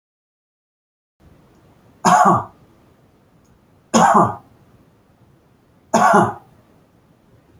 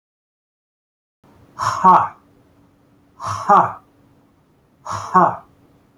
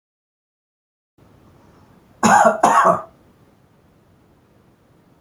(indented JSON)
{
  "three_cough_length": "7.6 s",
  "three_cough_amplitude": 29359,
  "three_cough_signal_mean_std_ratio": 0.33,
  "exhalation_length": "6.0 s",
  "exhalation_amplitude": 28131,
  "exhalation_signal_mean_std_ratio": 0.33,
  "cough_length": "5.2 s",
  "cough_amplitude": 29916,
  "cough_signal_mean_std_ratio": 0.31,
  "survey_phase": "beta (2021-08-13 to 2022-03-07)",
  "age": "45-64",
  "gender": "Male",
  "wearing_mask": "No",
  "symptom_cough_any": true,
  "smoker_status": "Ex-smoker",
  "respiratory_condition_asthma": false,
  "respiratory_condition_other": false,
  "recruitment_source": "REACT",
  "submission_delay": "1 day",
  "covid_test_result": "Negative",
  "covid_test_method": "RT-qPCR"
}